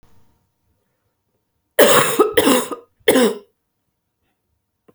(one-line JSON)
{"three_cough_length": "4.9 s", "three_cough_amplitude": 32768, "three_cough_signal_mean_std_ratio": 0.37, "survey_phase": "beta (2021-08-13 to 2022-03-07)", "age": "18-44", "gender": "Female", "wearing_mask": "No", "symptom_runny_or_blocked_nose": true, "symptom_shortness_of_breath": true, "symptom_abdominal_pain": true, "symptom_diarrhoea": true, "symptom_fatigue": true, "symptom_headache": true, "symptom_onset": "3 days", "smoker_status": "Never smoked", "respiratory_condition_asthma": false, "respiratory_condition_other": false, "recruitment_source": "Test and Trace", "submission_delay": "1 day", "covid_test_result": "Positive", "covid_test_method": "RT-qPCR", "covid_ct_value": 33.2, "covid_ct_gene": "N gene"}